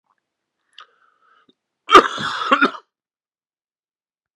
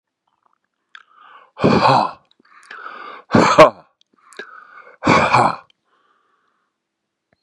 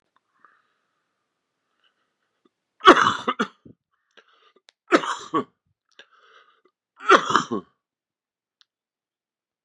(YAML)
cough_length: 4.4 s
cough_amplitude: 32768
cough_signal_mean_std_ratio: 0.24
exhalation_length: 7.4 s
exhalation_amplitude: 32768
exhalation_signal_mean_std_ratio: 0.34
three_cough_length: 9.6 s
three_cough_amplitude: 32768
three_cough_signal_mean_std_ratio: 0.22
survey_phase: beta (2021-08-13 to 2022-03-07)
age: 45-64
gender: Male
wearing_mask: 'No'
symptom_cough_any: true
symptom_runny_or_blocked_nose: true
symptom_other: true
smoker_status: Ex-smoker
respiratory_condition_asthma: false
respiratory_condition_other: false
recruitment_source: Test and Trace
submission_delay: 1 day
covid_test_result: Positive
covid_test_method: RT-qPCR
covid_ct_value: 17.4
covid_ct_gene: ORF1ab gene
covid_ct_mean: 17.6
covid_viral_load: 1700000 copies/ml
covid_viral_load_category: High viral load (>1M copies/ml)